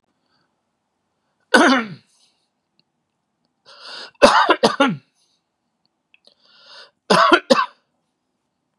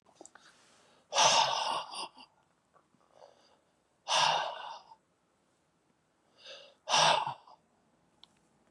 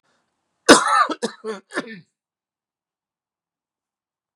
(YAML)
three_cough_length: 8.8 s
three_cough_amplitude: 32768
three_cough_signal_mean_std_ratio: 0.3
exhalation_length: 8.7 s
exhalation_amplitude: 8607
exhalation_signal_mean_std_ratio: 0.36
cough_length: 4.4 s
cough_amplitude: 32768
cough_signal_mean_std_ratio: 0.25
survey_phase: beta (2021-08-13 to 2022-03-07)
age: 45-64
gender: Male
wearing_mask: 'No'
symptom_none: true
smoker_status: Never smoked
respiratory_condition_asthma: false
respiratory_condition_other: false
recruitment_source: REACT
submission_delay: 1 day
covid_test_result: Negative
covid_test_method: RT-qPCR
influenza_a_test_result: Negative
influenza_b_test_result: Negative